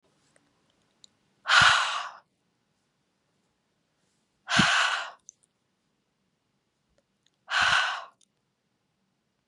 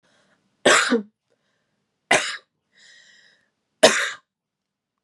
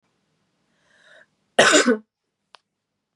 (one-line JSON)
{"exhalation_length": "9.5 s", "exhalation_amplitude": 16663, "exhalation_signal_mean_std_ratio": 0.31, "three_cough_length": "5.0 s", "three_cough_amplitude": 32664, "three_cough_signal_mean_std_ratio": 0.29, "cough_length": "3.2 s", "cough_amplitude": 30969, "cough_signal_mean_std_ratio": 0.27, "survey_phase": "beta (2021-08-13 to 2022-03-07)", "age": "18-44", "gender": "Female", "wearing_mask": "No", "symptom_fatigue": true, "symptom_headache": true, "symptom_onset": "12 days", "smoker_status": "Never smoked", "respiratory_condition_asthma": false, "respiratory_condition_other": false, "recruitment_source": "REACT", "submission_delay": "1 day", "covid_test_result": "Negative", "covid_test_method": "RT-qPCR", "influenza_a_test_result": "Negative", "influenza_b_test_result": "Negative"}